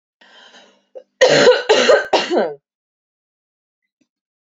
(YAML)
cough_length: 4.4 s
cough_amplitude: 32768
cough_signal_mean_std_ratio: 0.4
survey_phase: beta (2021-08-13 to 2022-03-07)
age: 18-44
gender: Female
wearing_mask: 'No'
symptom_cough_any: true
symptom_runny_or_blocked_nose: true
symptom_fatigue: true
symptom_onset: 2 days
smoker_status: Never smoked
respiratory_condition_asthma: false
respiratory_condition_other: false
recruitment_source: Test and Trace
submission_delay: 1 day
covid_test_result: Positive
covid_test_method: ePCR